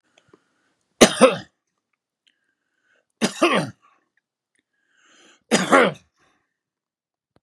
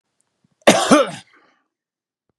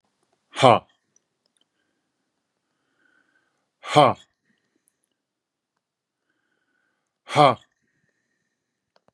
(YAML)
three_cough_length: 7.4 s
three_cough_amplitude: 32768
three_cough_signal_mean_std_ratio: 0.26
cough_length: 2.4 s
cough_amplitude: 32768
cough_signal_mean_std_ratio: 0.31
exhalation_length: 9.1 s
exhalation_amplitude: 32091
exhalation_signal_mean_std_ratio: 0.18
survey_phase: beta (2021-08-13 to 2022-03-07)
age: 45-64
gender: Male
wearing_mask: 'No'
symptom_none: true
smoker_status: Never smoked
respiratory_condition_asthma: false
respiratory_condition_other: false
recruitment_source: REACT
submission_delay: 2 days
covid_test_result: Negative
covid_test_method: RT-qPCR
influenza_a_test_result: Negative
influenza_b_test_result: Negative